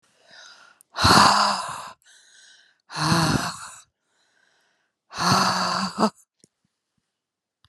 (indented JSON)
{
  "exhalation_length": "7.7 s",
  "exhalation_amplitude": 29591,
  "exhalation_signal_mean_std_ratio": 0.42,
  "survey_phase": "alpha (2021-03-01 to 2021-08-12)",
  "age": "65+",
  "gender": "Female",
  "wearing_mask": "No",
  "symptom_none": true,
  "smoker_status": "Ex-smoker",
  "respiratory_condition_asthma": false,
  "respiratory_condition_other": false,
  "recruitment_source": "REACT",
  "submission_delay": "1 day",
  "covid_test_result": "Negative",
  "covid_test_method": "RT-qPCR"
}